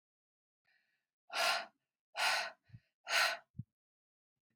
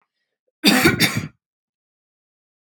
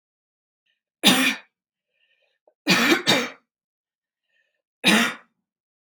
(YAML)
exhalation_length: 4.6 s
exhalation_amplitude: 3632
exhalation_signal_mean_std_ratio: 0.37
cough_length: 2.6 s
cough_amplitude: 31575
cough_signal_mean_std_ratio: 0.35
three_cough_length: 5.9 s
three_cough_amplitude: 29877
three_cough_signal_mean_std_ratio: 0.35
survey_phase: beta (2021-08-13 to 2022-03-07)
age: 18-44
gender: Female
wearing_mask: 'No'
symptom_none: true
smoker_status: Never smoked
respiratory_condition_asthma: true
respiratory_condition_other: false
recruitment_source: REACT
submission_delay: 1 day
covid_test_result: Negative
covid_test_method: RT-qPCR